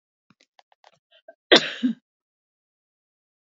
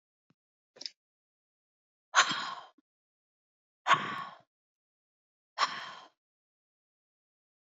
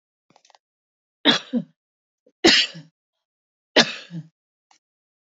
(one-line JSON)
{"cough_length": "3.5 s", "cough_amplitude": 31067, "cough_signal_mean_std_ratio": 0.18, "exhalation_length": "7.7 s", "exhalation_amplitude": 14361, "exhalation_signal_mean_std_ratio": 0.23, "three_cough_length": "5.2 s", "three_cough_amplitude": 29483, "three_cough_signal_mean_std_ratio": 0.26, "survey_phase": "beta (2021-08-13 to 2022-03-07)", "age": "45-64", "gender": "Female", "wearing_mask": "No", "symptom_none": true, "smoker_status": "Never smoked", "respiratory_condition_asthma": false, "respiratory_condition_other": false, "recruitment_source": "REACT", "submission_delay": "2 days", "covid_test_result": "Negative", "covid_test_method": "RT-qPCR", "influenza_a_test_result": "Negative", "influenza_b_test_result": "Negative"}